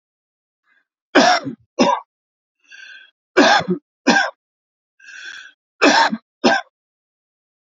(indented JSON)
{
  "three_cough_length": "7.7 s",
  "three_cough_amplitude": 32767,
  "three_cough_signal_mean_std_ratio": 0.37,
  "survey_phase": "alpha (2021-03-01 to 2021-08-12)",
  "age": "45-64",
  "gender": "Male",
  "wearing_mask": "No",
  "symptom_none": true,
  "smoker_status": "Ex-smoker",
  "respiratory_condition_asthma": false,
  "respiratory_condition_other": false,
  "recruitment_source": "REACT",
  "submission_delay": "1 day",
  "covid_test_result": "Negative",
  "covid_test_method": "RT-qPCR"
}